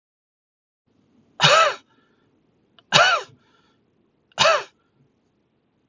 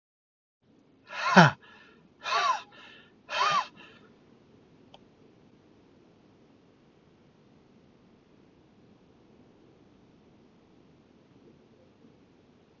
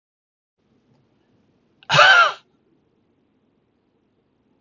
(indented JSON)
{
  "three_cough_length": "5.9 s",
  "three_cough_amplitude": 32766,
  "three_cough_signal_mean_std_ratio": 0.3,
  "exhalation_length": "12.8 s",
  "exhalation_amplitude": 28176,
  "exhalation_signal_mean_std_ratio": 0.22,
  "cough_length": "4.6 s",
  "cough_amplitude": 32767,
  "cough_signal_mean_std_ratio": 0.24,
  "survey_phase": "alpha (2021-03-01 to 2021-08-12)",
  "age": "65+",
  "gender": "Male",
  "wearing_mask": "No",
  "symptom_none": true,
  "smoker_status": "Ex-smoker",
  "respiratory_condition_asthma": false,
  "respiratory_condition_other": false,
  "recruitment_source": "REACT",
  "submission_delay": "7 days",
  "covid_test_result": "Negative",
  "covid_test_method": "RT-qPCR"
}